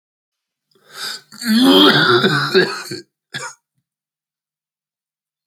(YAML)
cough_length: 5.5 s
cough_amplitude: 32768
cough_signal_mean_std_ratio: 0.43
survey_phase: beta (2021-08-13 to 2022-03-07)
age: 45-64
gender: Male
wearing_mask: 'No'
symptom_cough_any: true
symptom_new_continuous_cough: true
symptom_shortness_of_breath: true
symptom_sore_throat: true
symptom_fatigue: true
symptom_headache: true
smoker_status: Never smoked
respiratory_condition_asthma: true
respiratory_condition_other: true
recruitment_source: Test and Trace
submission_delay: 0 days
covid_test_result: Positive
covid_test_method: LFT